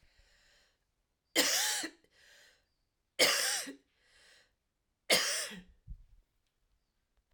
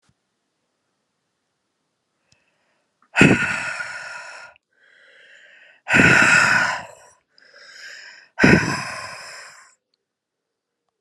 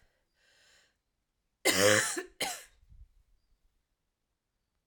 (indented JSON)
{
  "three_cough_length": "7.3 s",
  "three_cough_amplitude": 7928,
  "three_cough_signal_mean_std_ratio": 0.35,
  "exhalation_length": "11.0 s",
  "exhalation_amplitude": 32758,
  "exhalation_signal_mean_std_ratio": 0.34,
  "cough_length": "4.9 s",
  "cough_amplitude": 11152,
  "cough_signal_mean_std_ratio": 0.28,
  "survey_phase": "alpha (2021-03-01 to 2021-08-12)",
  "age": "45-64",
  "gender": "Female",
  "wearing_mask": "No",
  "symptom_cough_any": true,
  "symptom_new_continuous_cough": true,
  "symptom_diarrhoea": true,
  "symptom_fatigue": true,
  "symptom_headache": true,
  "symptom_onset": "3 days",
  "smoker_status": "Never smoked",
  "respiratory_condition_asthma": false,
  "respiratory_condition_other": false,
  "recruitment_source": "Test and Trace",
  "submission_delay": "2 days",
  "covid_test_result": "Positive",
  "covid_test_method": "RT-qPCR",
  "covid_ct_value": 19.4,
  "covid_ct_gene": "ORF1ab gene"
}